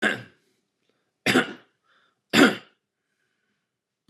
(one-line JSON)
{"three_cough_length": "4.1 s", "three_cough_amplitude": 26362, "three_cough_signal_mean_std_ratio": 0.27, "survey_phase": "beta (2021-08-13 to 2022-03-07)", "age": "45-64", "gender": "Male", "wearing_mask": "No", "symptom_none": true, "smoker_status": "Ex-smoker", "respiratory_condition_asthma": false, "respiratory_condition_other": false, "recruitment_source": "REACT", "submission_delay": "3 days", "covid_test_result": "Negative", "covid_test_method": "RT-qPCR", "influenza_a_test_result": "Unknown/Void", "influenza_b_test_result": "Unknown/Void"}